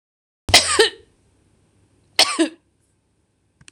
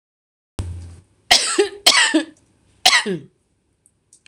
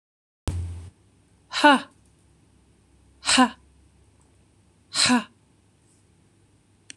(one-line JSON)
{"cough_length": "3.7 s", "cough_amplitude": 26028, "cough_signal_mean_std_ratio": 0.3, "three_cough_length": "4.3 s", "three_cough_amplitude": 26028, "three_cough_signal_mean_std_ratio": 0.39, "exhalation_length": "7.0 s", "exhalation_amplitude": 25080, "exhalation_signal_mean_std_ratio": 0.28, "survey_phase": "beta (2021-08-13 to 2022-03-07)", "age": "45-64", "gender": "Female", "wearing_mask": "No", "symptom_none": true, "smoker_status": "Never smoked", "respiratory_condition_asthma": false, "respiratory_condition_other": false, "recruitment_source": "REACT", "submission_delay": "1 day", "covid_test_result": "Negative", "covid_test_method": "RT-qPCR", "influenza_a_test_result": "Negative", "influenza_b_test_result": "Negative"}